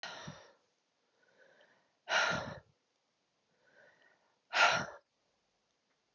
{
  "exhalation_length": "6.1 s",
  "exhalation_amplitude": 6641,
  "exhalation_signal_mean_std_ratio": 0.29,
  "survey_phase": "beta (2021-08-13 to 2022-03-07)",
  "age": "65+",
  "gender": "Female",
  "wearing_mask": "No",
  "symptom_cough_any": true,
  "symptom_new_continuous_cough": true,
  "symptom_runny_or_blocked_nose": true,
  "symptom_sore_throat": true,
  "symptom_change_to_sense_of_smell_or_taste": true,
  "symptom_loss_of_taste": true,
  "symptom_onset": "3 days",
  "smoker_status": "Never smoked",
  "respiratory_condition_asthma": false,
  "respiratory_condition_other": false,
  "recruitment_source": "Test and Trace",
  "submission_delay": "1 day",
  "covid_test_result": "Negative",
  "covid_test_method": "ePCR"
}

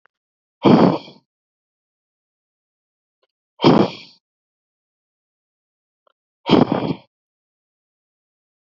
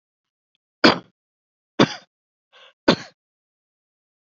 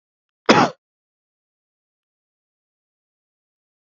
{
  "exhalation_length": "8.8 s",
  "exhalation_amplitude": 32768,
  "exhalation_signal_mean_std_ratio": 0.25,
  "three_cough_length": "4.4 s",
  "three_cough_amplitude": 29369,
  "three_cough_signal_mean_std_ratio": 0.19,
  "cough_length": "3.8 s",
  "cough_amplitude": 27847,
  "cough_signal_mean_std_ratio": 0.17,
  "survey_phase": "beta (2021-08-13 to 2022-03-07)",
  "age": "18-44",
  "gender": "Male",
  "wearing_mask": "No",
  "symptom_none": true,
  "symptom_onset": "12 days",
  "smoker_status": "Never smoked",
  "respiratory_condition_asthma": false,
  "respiratory_condition_other": false,
  "recruitment_source": "REACT",
  "submission_delay": "1 day",
  "covid_test_result": "Negative",
  "covid_test_method": "RT-qPCR",
  "influenza_a_test_result": "Negative",
  "influenza_b_test_result": "Negative"
}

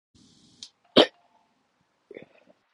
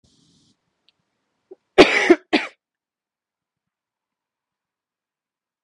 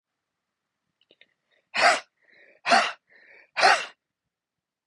{
  "three_cough_length": "2.7 s",
  "three_cough_amplitude": 26237,
  "three_cough_signal_mean_std_ratio": 0.15,
  "cough_length": "5.6 s",
  "cough_amplitude": 31910,
  "cough_signal_mean_std_ratio": 0.19,
  "exhalation_length": "4.9 s",
  "exhalation_amplitude": 19562,
  "exhalation_signal_mean_std_ratio": 0.3,
  "survey_phase": "beta (2021-08-13 to 2022-03-07)",
  "age": "18-44",
  "gender": "Female",
  "wearing_mask": "No",
  "symptom_cough_any": true,
  "symptom_new_continuous_cough": true,
  "symptom_runny_or_blocked_nose": true,
  "symptom_shortness_of_breath": true,
  "symptom_sore_throat": true,
  "symptom_fatigue": true,
  "symptom_headache": true,
  "symptom_onset": "7 days",
  "smoker_status": "Current smoker (1 to 10 cigarettes per day)",
  "respiratory_condition_asthma": false,
  "respiratory_condition_other": false,
  "recruitment_source": "Test and Trace",
  "submission_delay": "2 days",
  "covid_test_result": "Positive",
  "covid_test_method": "RT-qPCR",
  "covid_ct_value": 27.4,
  "covid_ct_gene": "ORF1ab gene",
  "covid_ct_mean": 28.0,
  "covid_viral_load": "640 copies/ml",
  "covid_viral_load_category": "Minimal viral load (< 10K copies/ml)"
}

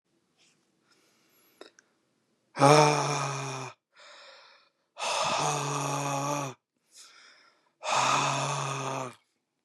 {
  "exhalation_length": "9.6 s",
  "exhalation_amplitude": 18197,
  "exhalation_signal_mean_std_ratio": 0.46,
  "survey_phase": "beta (2021-08-13 to 2022-03-07)",
  "age": "18-44",
  "gender": "Male",
  "wearing_mask": "No",
  "symptom_none": true,
  "smoker_status": "Current smoker (11 or more cigarettes per day)",
  "respiratory_condition_asthma": false,
  "respiratory_condition_other": false,
  "recruitment_source": "REACT",
  "submission_delay": "2 days",
  "covid_test_result": "Negative",
  "covid_test_method": "RT-qPCR",
  "influenza_a_test_result": "Negative",
  "influenza_b_test_result": "Negative"
}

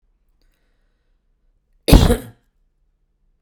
{
  "cough_length": "3.4 s",
  "cough_amplitude": 32768,
  "cough_signal_mean_std_ratio": 0.22,
  "survey_phase": "beta (2021-08-13 to 2022-03-07)",
  "age": "45-64",
  "gender": "Female",
  "wearing_mask": "No",
  "symptom_none": true,
  "smoker_status": "Ex-smoker",
  "respiratory_condition_asthma": false,
  "respiratory_condition_other": false,
  "recruitment_source": "REACT",
  "submission_delay": "3 days",
  "covid_test_result": "Negative",
  "covid_test_method": "RT-qPCR",
  "influenza_a_test_result": "Negative",
  "influenza_b_test_result": "Negative"
}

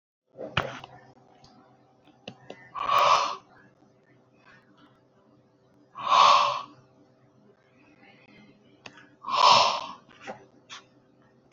{
  "exhalation_length": "11.5 s",
  "exhalation_amplitude": 18311,
  "exhalation_signal_mean_std_ratio": 0.33,
  "survey_phase": "beta (2021-08-13 to 2022-03-07)",
  "age": "45-64",
  "gender": "Male",
  "wearing_mask": "No",
  "symptom_none": true,
  "smoker_status": "Ex-smoker",
  "respiratory_condition_asthma": false,
  "respiratory_condition_other": false,
  "recruitment_source": "REACT",
  "submission_delay": "3 days",
  "covid_test_result": "Negative",
  "covid_test_method": "RT-qPCR",
  "influenza_a_test_result": "Negative",
  "influenza_b_test_result": "Negative"
}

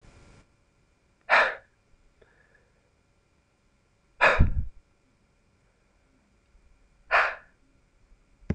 {
  "exhalation_length": "8.5 s",
  "exhalation_amplitude": 18227,
  "exhalation_signal_mean_std_ratio": 0.26,
  "survey_phase": "beta (2021-08-13 to 2022-03-07)",
  "age": "18-44",
  "gender": "Male",
  "wearing_mask": "No",
  "symptom_none": true,
  "symptom_onset": "13 days",
  "smoker_status": "Never smoked",
  "respiratory_condition_asthma": true,
  "respiratory_condition_other": false,
  "recruitment_source": "REACT",
  "submission_delay": "2 days",
  "covid_test_result": "Positive",
  "covid_test_method": "RT-qPCR",
  "covid_ct_value": 36.0,
  "covid_ct_gene": "N gene",
  "influenza_a_test_result": "Negative",
  "influenza_b_test_result": "Negative"
}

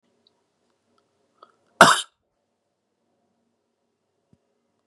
{
  "cough_length": "4.9 s",
  "cough_amplitude": 32768,
  "cough_signal_mean_std_ratio": 0.14,
  "survey_phase": "beta (2021-08-13 to 2022-03-07)",
  "age": "45-64",
  "gender": "Male",
  "wearing_mask": "No",
  "symptom_cough_any": true,
  "symptom_runny_or_blocked_nose": true,
  "symptom_onset": "2 days",
  "smoker_status": "Ex-smoker",
  "respiratory_condition_asthma": false,
  "respiratory_condition_other": false,
  "recruitment_source": "Test and Trace",
  "submission_delay": "2 days",
  "covid_test_result": "Positive",
  "covid_test_method": "RT-qPCR",
  "covid_ct_value": 26.5,
  "covid_ct_gene": "ORF1ab gene",
  "covid_ct_mean": 26.8,
  "covid_viral_load": "1600 copies/ml",
  "covid_viral_load_category": "Minimal viral load (< 10K copies/ml)"
}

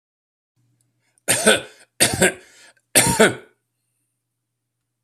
{
  "three_cough_length": "5.0 s",
  "three_cough_amplitude": 32768,
  "three_cough_signal_mean_std_ratio": 0.33,
  "survey_phase": "alpha (2021-03-01 to 2021-08-12)",
  "age": "65+",
  "gender": "Male",
  "wearing_mask": "No",
  "symptom_none": true,
  "smoker_status": "Ex-smoker",
  "respiratory_condition_asthma": false,
  "respiratory_condition_other": false,
  "recruitment_source": "REACT",
  "submission_delay": "2 days",
  "covid_test_result": "Negative",
  "covid_test_method": "RT-qPCR"
}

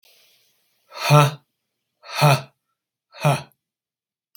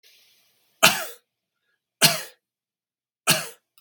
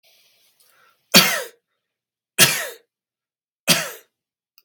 {
  "exhalation_length": "4.4 s",
  "exhalation_amplitude": 32767,
  "exhalation_signal_mean_std_ratio": 0.31,
  "three_cough_length": "3.8 s",
  "three_cough_amplitude": 32767,
  "three_cough_signal_mean_std_ratio": 0.26,
  "cough_length": "4.6 s",
  "cough_amplitude": 32768,
  "cough_signal_mean_std_ratio": 0.28,
  "survey_phase": "beta (2021-08-13 to 2022-03-07)",
  "age": "45-64",
  "gender": "Male",
  "wearing_mask": "No",
  "symptom_none": true,
  "smoker_status": "Never smoked",
  "respiratory_condition_asthma": true,
  "respiratory_condition_other": false,
  "recruitment_source": "REACT",
  "submission_delay": "8 days",
  "covid_test_result": "Negative",
  "covid_test_method": "RT-qPCR",
  "influenza_a_test_result": "Negative",
  "influenza_b_test_result": "Negative"
}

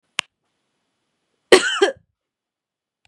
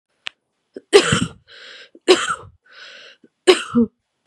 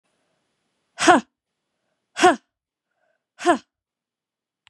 {
  "cough_length": "3.1 s",
  "cough_amplitude": 32768,
  "cough_signal_mean_std_ratio": 0.22,
  "three_cough_length": "4.3 s",
  "three_cough_amplitude": 32768,
  "three_cough_signal_mean_std_ratio": 0.33,
  "exhalation_length": "4.7 s",
  "exhalation_amplitude": 30684,
  "exhalation_signal_mean_std_ratio": 0.24,
  "survey_phase": "beta (2021-08-13 to 2022-03-07)",
  "age": "18-44",
  "gender": "Female",
  "wearing_mask": "No",
  "symptom_cough_any": true,
  "symptom_runny_or_blocked_nose": true,
  "symptom_shortness_of_breath": true,
  "symptom_fatigue": true,
  "symptom_change_to_sense_of_smell_or_taste": true,
  "smoker_status": "Ex-smoker",
  "respiratory_condition_asthma": false,
  "respiratory_condition_other": false,
  "recruitment_source": "Test and Trace",
  "submission_delay": "1 day",
  "covid_test_result": "Positive",
  "covid_test_method": "RT-qPCR",
  "covid_ct_value": 18.6,
  "covid_ct_gene": "N gene"
}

